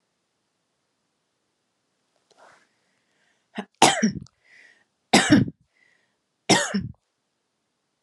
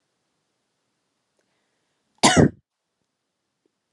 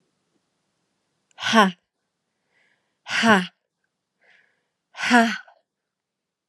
{"three_cough_length": "8.0 s", "three_cough_amplitude": 30714, "three_cough_signal_mean_std_ratio": 0.26, "cough_length": "3.9 s", "cough_amplitude": 28792, "cough_signal_mean_std_ratio": 0.19, "exhalation_length": "6.5 s", "exhalation_amplitude": 29319, "exhalation_signal_mean_std_ratio": 0.29, "survey_phase": "alpha (2021-03-01 to 2021-08-12)", "age": "18-44", "gender": "Male", "wearing_mask": "No", "symptom_none": true, "symptom_onset": "4 days", "smoker_status": "Never smoked", "respiratory_condition_asthma": false, "respiratory_condition_other": false, "recruitment_source": "Test and Trace", "submission_delay": "1 day", "covid_test_result": "Positive", "covid_test_method": "RT-qPCR", "covid_ct_value": 25.9, "covid_ct_gene": "ORF1ab gene"}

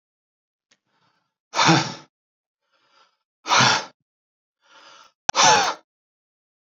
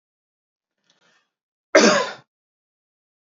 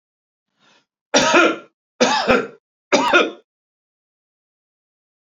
{"exhalation_length": "6.7 s", "exhalation_amplitude": 29072, "exhalation_signal_mean_std_ratio": 0.32, "cough_length": "3.2 s", "cough_amplitude": 32432, "cough_signal_mean_std_ratio": 0.24, "three_cough_length": "5.2 s", "three_cough_amplitude": 31103, "three_cough_signal_mean_std_ratio": 0.38, "survey_phase": "beta (2021-08-13 to 2022-03-07)", "age": "45-64", "gender": "Male", "wearing_mask": "No", "symptom_none": true, "smoker_status": "Never smoked", "respiratory_condition_asthma": false, "respiratory_condition_other": false, "recruitment_source": "REACT", "submission_delay": "1 day", "covid_test_result": "Negative", "covid_test_method": "RT-qPCR"}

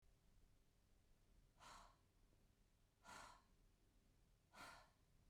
{"exhalation_length": "5.3 s", "exhalation_amplitude": 142, "exhalation_signal_mean_std_ratio": 0.7, "survey_phase": "beta (2021-08-13 to 2022-03-07)", "age": "45-64", "gender": "Female", "wearing_mask": "No", "symptom_none": true, "smoker_status": "Never smoked", "respiratory_condition_asthma": false, "respiratory_condition_other": false, "recruitment_source": "REACT", "submission_delay": "1 day", "covid_test_result": "Negative", "covid_test_method": "RT-qPCR"}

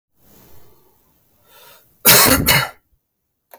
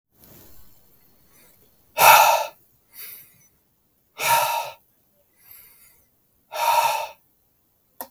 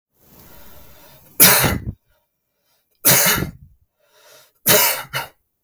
{"cough_length": "3.6 s", "cough_amplitude": 32768, "cough_signal_mean_std_ratio": 0.34, "exhalation_length": "8.1 s", "exhalation_amplitude": 32768, "exhalation_signal_mean_std_ratio": 0.33, "three_cough_length": "5.6 s", "three_cough_amplitude": 32768, "three_cough_signal_mean_std_ratio": 0.39, "survey_phase": "beta (2021-08-13 to 2022-03-07)", "age": "18-44", "gender": "Male", "wearing_mask": "No", "symptom_none": true, "smoker_status": "Never smoked", "respiratory_condition_asthma": false, "respiratory_condition_other": false, "recruitment_source": "REACT", "submission_delay": "2 days", "covid_test_result": "Negative", "covid_test_method": "RT-qPCR", "influenza_a_test_result": "Negative", "influenza_b_test_result": "Negative"}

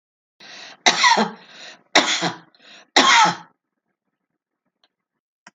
{"three_cough_length": "5.5 s", "three_cough_amplitude": 32767, "three_cough_signal_mean_std_ratio": 0.36, "survey_phase": "alpha (2021-03-01 to 2021-08-12)", "age": "65+", "gender": "Female", "wearing_mask": "No", "symptom_none": true, "smoker_status": "Never smoked", "respiratory_condition_asthma": false, "respiratory_condition_other": false, "recruitment_source": "REACT", "submission_delay": "31 days", "covid_test_result": "Negative", "covid_test_method": "RT-qPCR"}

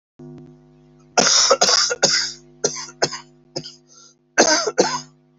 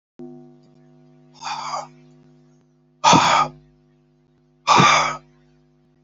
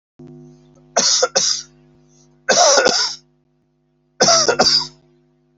{"cough_length": "5.4 s", "cough_amplitude": 32768, "cough_signal_mean_std_ratio": 0.48, "exhalation_length": "6.0 s", "exhalation_amplitude": 28170, "exhalation_signal_mean_std_ratio": 0.36, "three_cough_length": "5.6 s", "three_cough_amplitude": 32768, "three_cough_signal_mean_std_ratio": 0.48, "survey_phase": "beta (2021-08-13 to 2022-03-07)", "age": "65+", "gender": "Male", "wearing_mask": "No", "symptom_cough_any": true, "symptom_shortness_of_breath": true, "symptom_sore_throat": true, "symptom_fatigue": true, "symptom_fever_high_temperature": true, "symptom_headache": true, "symptom_onset": "4 days", "smoker_status": "Never smoked", "respiratory_condition_asthma": false, "respiratory_condition_other": false, "recruitment_source": "Test and Trace", "submission_delay": "2 days", "covid_test_result": "Positive", "covid_test_method": "RT-qPCR", "covid_ct_value": 15.0, "covid_ct_gene": "ORF1ab gene", "covid_ct_mean": 15.2, "covid_viral_load": "10000000 copies/ml", "covid_viral_load_category": "High viral load (>1M copies/ml)"}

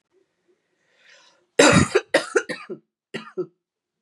{"cough_length": "4.0 s", "cough_amplitude": 29547, "cough_signal_mean_std_ratio": 0.31, "survey_phase": "beta (2021-08-13 to 2022-03-07)", "age": "18-44", "gender": "Female", "wearing_mask": "No", "symptom_cough_any": true, "symptom_runny_or_blocked_nose": true, "symptom_shortness_of_breath": true, "symptom_abdominal_pain": true, "symptom_fatigue": true, "symptom_loss_of_taste": true, "smoker_status": "Never smoked", "respiratory_condition_asthma": false, "respiratory_condition_other": false, "recruitment_source": "Test and Trace", "submission_delay": "2 days", "covid_test_result": "Positive", "covid_test_method": "RT-qPCR", "covid_ct_value": 22.9, "covid_ct_gene": "N gene", "covid_ct_mean": 24.1, "covid_viral_load": "13000 copies/ml", "covid_viral_load_category": "Low viral load (10K-1M copies/ml)"}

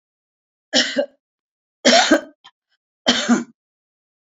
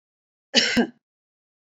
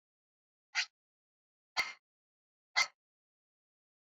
{"three_cough_length": "4.3 s", "three_cough_amplitude": 32566, "three_cough_signal_mean_std_ratio": 0.36, "cough_length": "1.7 s", "cough_amplitude": 22977, "cough_signal_mean_std_ratio": 0.33, "exhalation_length": "4.0 s", "exhalation_amplitude": 4636, "exhalation_signal_mean_std_ratio": 0.2, "survey_phase": "beta (2021-08-13 to 2022-03-07)", "age": "65+", "gender": "Female", "wearing_mask": "No", "symptom_none": true, "smoker_status": "Ex-smoker", "respiratory_condition_asthma": false, "respiratory_condition_other": false, "recruitment_source": "REACT", "submission_delay": "1 day", "covid_test_result": "Negative", "covid_test_method": "RT-qPCR", "influenza_a_test_result": "Positive", "influenza_a_ct_value": 31.0, "influenza_b_test_result": "Positive", "influenza_b_ct_value": 30.7}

